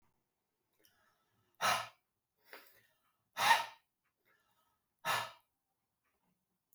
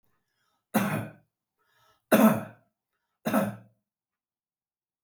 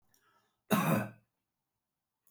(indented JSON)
{
  "exhalation_length": "6.7 s",
  "exhalation_amplitude": 6280,
  "exhalation_signal_mean_std_ratio": 0.25,
  "three_cough_length": "5.0 s",
  "three_cough_amplitude": 14124,
  "three_cough_signal_mean_std_ratio": 0.31,
  "cough_length": "2.3 s",
  "cough_amplitude": 5463,
  "cough_signal_mean_std_ratio": 0.33,
  "survey_phase": "beta (2021-08-13 to 2022-03-07)",
  "age": "45-64",
  "gender": "Male",
  "wearing_mask": "No",
  "symptom_none": true,
  "smoker_status": "Never smoked",
  "respiratory_condition_asthma": false,
  "respiratory_condition_other": true,
  "recruitment_source": "REACT",
  "submission_delay": "2 days",
  "covid_test_result": "Negative",
  "covid_test_method": "RT-qPCR",
  "influenza_a_test_result": "Unknown/Void",
  "influenza_b_test_result": "Unknown/Void"
}